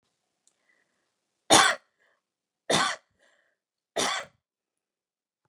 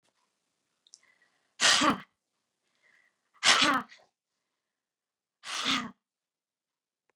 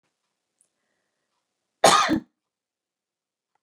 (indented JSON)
{
  "three_cough_length": "5.5 s",
  "three_cough_amplitude": 25861,
  "three_cough_signal_mean_std_ratio": 0.25,
  "exhalation_length": "7.2 s",
  "exhalation_amplitude": 13877,
  "exhalation_signal_mean_std_ratio": 0.28,
  "cough_length": "3.6 s",
  "cough_amplitude": 21448,
  "cough_signal_mean_std_ratio": 0.23,
  "survey_phase": "beta (2021-08-13 to 2022-03-07)",
  "age": "45-64",
  "gender": "Female",
  "wearing_mask": "No",
  "symptom_none": true,
  "smoker_status": "Ex-smoker",
  "respiratory_condition_asthma": true,
  "respiratory_condition_other": false,
  "recruitment_source": "REACT",
  "submission_delay": "2 days",
  "covid_test_result": "Negative",
  "covid_test_method": "RT-qPCR"
}